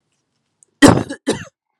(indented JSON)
{
  "cough_length": "1.8 s",
  "cough_amplitude": 32768,
  "cough_signal_mean_std_ratio": 0.29,
  "survey_phase": "beta (2021-08-13 to 2022-03-07)",
  "age": "18-44",
  "gender": "Female",
  "wearing_mask": "No",
  "symptom_cough_any": true,
  "symptom_new_continuous_cough": true,
  "symptom_sore_throat": true,
  "symptom_change_to_sense_of_smell_or_taste": true,
  "symptom_loss_of_taste": true,
  "symptom_onset": "3 days",
  "smoker_status": "Never smoked",
  "respiratory_condition_asthma": false,
  "respiratory_condition_other": false,
  "recruitment_source": "Test and Trace",
  "submission_delay": "2 days",
  "covid_test_result": "Positive",
  "covid_test_method": "RT-qPCR",
  "covid_ct_value": 22.7,
  "covid_ct_gene": "ORF1ab gene",
  "covid_ct_mean": 23.2,
  "covid_viral_load": "24000 copies/ml",
  "covid_viral_load_category": "Low viral load (10K-1M copies/ml)"
}